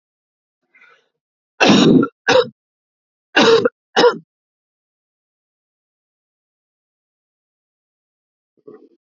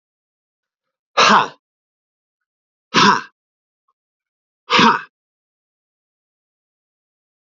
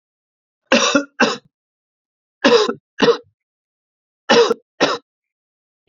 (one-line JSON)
{"cough_length": "9.0 s", "cough_amplitude": 29424, "cough_signal_mean_std_ratio": 0.29, "exhalation_length": "7.4 s", "exhalation_amplitude": 32768, "exhalation_signal_mean_std_ratio": 0.26, "three_cough_length": "5.9 s", "three_cough_amplitude": 28948, "three_cough_signal_mean_std_ratio": 0.37, "survey_phase": "beta (2021-08-13 to 2022-03-07)", "age": "45-64", "gender": "Male", "wearing_mask": "No", "symptom_cough_any": true, "symptom_runny_or_blocked_nose": true, "symptom_headache": true, "smoker_status": "Never smoked", "respiratory_condition_asthma": false, "respiratory_condition_other": false, "recruitment_source": "Test and Trace", "submission_delay": "1 day", "covid_test_result": "Positive", "covid_test_method": "RT-qPCR"}